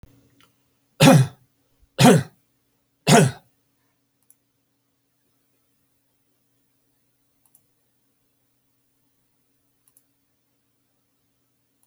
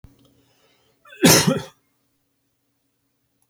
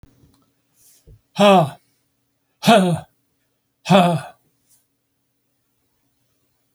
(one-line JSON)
{"three_cough_length": "11.9 s", "three_cough_amplitude": 30784, "three_cough_signal_mean_std_ratio": 0.2, "cough_length": "3.5 s", "cough_amplitude": 31325, "cough_signal_mean_std_ratio": 0.25, "exhalation_length": "6.7 s", "exhalation_amplitude": 27617, "exhalation_signal_mean_std_ratio": 0.31, "survey_phase": "alpha (2021-03-01 to 2021-08-12)", "age": "65+", "gender": "Male", "wearing_mask": "No", "symptom_none": true, "smoker_status": "Never smoked", "respiratory_condition_asthma": false, "respiratory_condition_other": false, "recruitment_source": "REACT", "submission_delay": "1 day", "covid_test_result": "Negative", "covid_test_method": "RT-qPCR"}